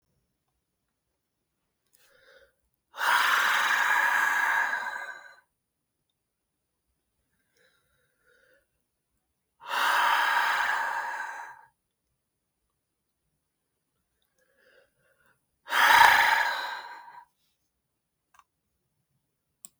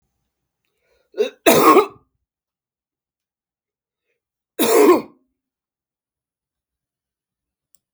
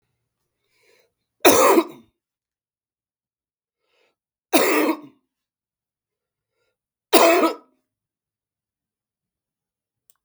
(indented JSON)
{
  "exhalation_length": "19.8 s",
  "exhalation_amplitude": 22035,
  "exhalation_signal_mean_std_ratio": 0.38,
  "cough_length": "7.9 s",
  "cough_amplitude": 32766,
  "cough_signal_mean_std_ratio": 0.27,
  "three_cough_length": "10.2 s",
  "three_cough_amplitude": 32768,
  "three_cough_signal_mean_std_ratio": 0.27,
  "survey_phase": "beta (2021-08-13 to 2022-03-07)",
  "age": "65+",
  "gender": "Male",
  "wearing_mask": "No",
  "symptom_none": true,
  "smoker_status": "Never smoked",
  "respiratory_condition_asthma": false,
  "respiratory_condition_other": false,
  "recruitment_source": "REACT",
  "submission_delay": "1 day",
  "covid_test_result": "Negative",
  "covid_test_method": "RT-qPCR",
  "influenza_a_test_result": "Negative",
  "influenza_b_test_result": "Negative"
}